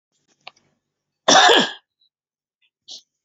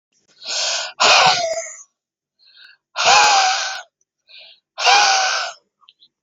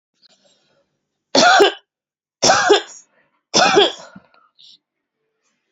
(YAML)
cough_length: 3.2 s
cough_amplitude: 32767
cough_signal_mean_std_ratio: 0.29
exhalation_length: 6.2 s
exhalation_amplitude: 29520
exhalation_signal_mean_std_ratio: 0.52
three_cough_length: 5.7 s
three_cough_amplitude: 32767
three_cough_signal_mean_std_ratio: 0.37
survey_phase: beta (2021-08-13 to 2022-03-07)
age: 18-44
gender: Female
wearing_mask: 'No'
symptom_runny_or_blocked_nose: true
symptom_fatigue: true
symptom_onset: 12 days
smoker_status: Current smoker (11 or more cigarettes per day)
respiratory_condition_asthma: false
respiratory_condition_other: false
recruitment_source: REACT
submission_delay: 1 day
covid_test_result: Negative
covid_test_method: RT-qPCR
influenza_a_test_result: Negative
influenza_b_test_result: Negative